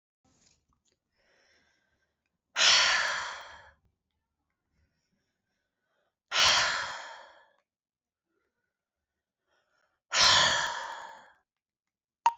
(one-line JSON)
{"exhalation_length": "12.4 s", "exhalation_amplitude": 12026, "exhalation_signal_mean_std_ratio": 0.33, "survey_phase": "beta (2021-08-13 to 2022-03-07)", "age": "45-64", "gender": "Female", "wearing_mask": "No", "symptom_cough_any": true, "symptom_headache": true, "symptom_onset": "8 days", "smoker_status": "Ex-smoker", "respiratory_condition_asthma": false, "respiratory_condition_other": false, "recruitment_source": "Test and Trace", "submission_delay": "2 days", "covid_test_result": "Positive", "covid_test_method": "RT-qPCR", "covid_ct_value": 19.2, "covid_ct_gene": "ORF1ab gene", "covid_ct_mean": 19.6, "covid_viral_load": "370000 copies/ml", "covid_viral_load_category": "Low viral load (10K-1M copies/ml)"}